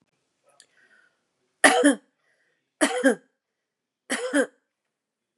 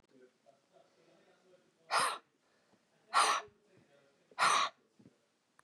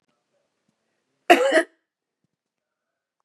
{
  "three_cough_length": "5.4 s",
  "three_cough_amplitude": 32641,
  "three_cough_signal_mean_std_ratio": 0.3,
  "exhalation_length": "5.6 s",
  "exhalation_amplitude": 5436,
  "exhalation_signal_mean_std_ratio": 0.32,
  "cough_length": "3.2 s",
  "cough_amplitude": 32169,
  "cough_signal_mean_std_ratio": 0.23,
  "survey_phase": "beta (2021-08-13 to 2022-03-07)",
  "age": "45-64",
  "gender": "Female",
  "wearing_mask": "No",
  "symptom_none": true,
  "smoker_status": "Never smoked",
  "respiratory_condition_asthma": false,
  "respiratory_condition_other": false,
  "recruitment_source": "REACT",
  "submission_delay": "1 day",
  "covid_test_result": "Negative",
  "covid_test_method": "RT-qPCR",
  "influenza_a_test_result": "Negative",
  "influenza_b_test_result": "Negative"
}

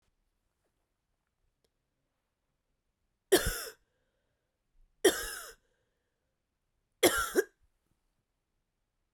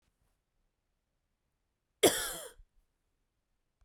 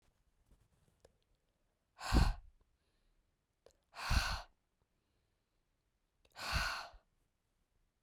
{
  "three_cough_length": "9.1 s",
  "three_cough_amplitude": 11149,
  "three_cough_signal_mean_std_ratio": 0.21,
  "cough_length": "3.8 s",
  "cough_amplitude": 10039,
  "cough_signal_mean_std_ratio": 0.19,
  "exhalation_length": "8.0 s",
  "exhalation_amplitude": 4513,
  "exhalation_signal_mean_std_ratio": 0.28,
  "survey_phase": "beta (2021-08-13 to 2022-03-07)",
  "age": "18-44",
  "gender": "Female",
  "wearing_mask": "No",
  "symptom_cough_any": true,
  "symptom_runny_or_blocked_nose": true,
  "symptom_sore_throat": true,
  "symptom_fatigue": true,
  "symptom_headache": true,
  "smoker_status": "Never smoked",
  "respiratory_condition_asthma": false,
  "respiratory_condition_other": false,
  "recruitment_source": "Test and Trace",
  "submission_delay": "1 day",
  "covid_test_result": "Positive",
  "covid_test_method": "RT-qPCR",
  "covid_ct_value": 18.9,
  "covid_ct_gene": "ORF1ab gene"
}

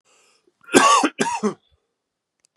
{
  "cough_length": "2.6 s",
  "cough_amplitude": 32768,
  "cough_signal_mean_std_ratio": 0.38,
  "survey_phase": "beta (2021-08-13 to 2022-03-07)",
  "age": "45-64",
  "gender": "Male",
  "wearing_mask": "No",
  "symptom_cough_any": true,
  "symptom_runny_or_blocked_nose": true,
  "symptom_shortness_of_breath": true,
  "symptom_fatigue": true,
  "symptom_headache": true,
  "symptom_onset": "4 days",
  "smoker_status": "Ex-smoker",
  "respiratory_condition_asthma": false,
  "respiratory_condition_other": false,
  "recruitment_source": "Test and Trace",
  "submission_delay": "2 days",
  "covid_test_result": "Positive",
  "covid_test_method": "RT-qPCR",
  "covid_ct_value": 18.3,
  "covid_ct_gene": "N gene",
  "covid_ct_mean": 18.6,
  "covid_viral_load": "820000 copies/ml",
  "covid_viral_load_category": "Low viral load (10K-1M copies/ml)"
}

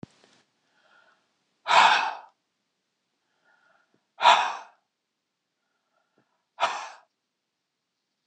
{
  "exhalation_length": "8.3 s",
  "exhalation_amplitude": 21732,
  "exhalation_signal_mean_std_ratio": 0.25,
  "survey_phase": "beta (2021-08-13 to 2022-03-07)",
  "age": "45-64",
  "gender": "Male",
  "wearing_mask": "No",
  "symptom_none": true,
  "smoker_status": "Never smoked",
  "respiratory_condition_asthma": false,
  "respiratory_condition_other": false,
  "recruitment_source": "REACT",
  "submission_delay": "1 day",
  "covid_test_result": "Negative",
  "covid_test_method": "RT-qPCR"
}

